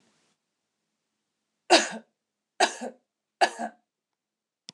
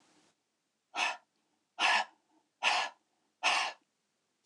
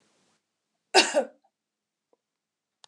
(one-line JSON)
{"three_cough_length": "4.7 s", "three_cough_amplitude": 21273, "three_cough_signal_mean_std_ratio": 0.23, "exhalation_length": "4.5 s", "exhalation_amplitude": 6274, "exhalation_signal_mean_std_ratio": 0.38, "cough_length": "2.9 s", "cough_amplitude": 24351, "cough_signal_mean_std_ratio": 0.22, "survey_phase": "beta (2021-08-13 to 2022-03-07)", "age": "45-64", "gender": "Female", "wearing_mask": "No", "symptom_change_to_sense_of_smell_or_taste": true, "smoker_status": "Never smoked", "respiratory_condition_asthma": false, "respiratory_condition_other": false, "recruitment_source": "Test and Trace", "submission_delay": "1 day", "covid_test_result": "Negative", "covid_test_method": "RT-qPCR"}